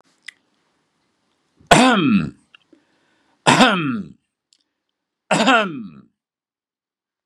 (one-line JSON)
{"three_cough_length": "7.3 s", "three_cough_amplitude": 32768, "three_cough_signal_mean_std_ratio": 0.35, "survey_phase": "beta (2021-08-13 to 2022-03-07)", "age": "65+", "gender": "Male", "wearing_mask": "No", "symptom_none": true, "smoker_status": "Never smoked", "respiratory_condition_asthma": false, "respiratory_condition_other": false, "recruitment_source": "REACT", "submission_delay": "2 days", "covid_test_result": "Negative", "covid_test_method": "RT-qPCR", "influenza_a_test_result": "Negative", "influenza_b_test_result": "Negative"}